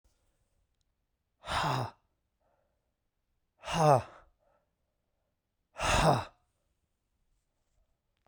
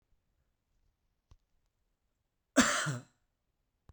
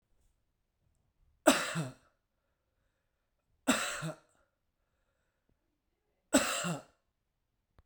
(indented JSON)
{
  "exhalation_length": "8.3 s",
  "exhalation_amplitude": 9511,
  "exhalation_signal_mean_std_ratio": 0.29,
  "cough_length": "3.9 s",
  "cough_amplitude": 10201,
  "cough_signal_mean_std_ratio": 0.23,
  "three_cough_length": "7.9 s",
  "three_cough_amplitude": 10475,
  "three_cough_signal_mean_std_ratio": 0.27,
  "survey_phase": "beta (2021-08-13 to 2022-03-07)",
  "age": "45-64",
  "gender": "Male",
  "wearing_mask": "No",
  "symptom_cough_any": true,
  "symptom_runny_or_blocked_nose": true,
  "symptom_headache": true,
  "symptom_change_to_sense_of_smell_or_taste": true,
  "symptom_onset": "5 days",
  "smoker_status": "Never smoked",
  "respiratory_condition_asthma": true,
  "respiratory_condition_other": false,
  "recruitment_source": "Test and Trace",
  "submission_delay": "1 day",
  "covid_test_result": "Positive",
  "covid_test_method": "RT-qPCR",
  "covid_ct_value": 13.4,
  "covid_ct_gene": "ORF1ab gene",
  "covid_ct_mean": 14.0,
  "covid_viral_load": "25000000 copies/ml",
  "covid_viral_load_category": "High viral load (>1M copies/ml)"
}